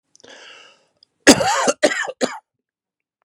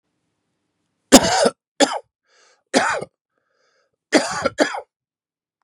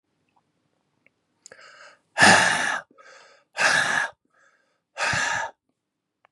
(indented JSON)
{
  "cough_length": "3.2 s",
  "cough_amplitude": 32768,
  "cough_signal_mean_std_ratio": 0.34,
  "three_cough_length": "5.6 s",
  "three_cough_amplitude": 32768,
  "three_cough_signal_mean_std_ratio": 0.32,
  "exhalation_length": "6.3 s",
  "exhalation_amplitude": 28681,
  "exhalation_signal_mean_std_ratio": 0.38,
  "survey_phase": "beta (2021-08-13 to 2022-03-07)",
  "age": "45-64",
  "gender": "Male",
  "wearing_mask": "No",
  "symptom_cough_any": true,
  "symptom_fatigue": true,
  "symptom_headache": true,
  "smoker_status": "Never smoked",
  "respiratory_condition_asthma": false,
  "respiratory_condition_other": false,
  "recruitment_source": "Test and Trace",
  "submission_delay": "1 day",
  "covid_test_result": "Positive",
  "covid_test_method": "RT-qPCR",
  "covid_ct_value": 15.6,
  "covid_ct_gene": "S gene"
}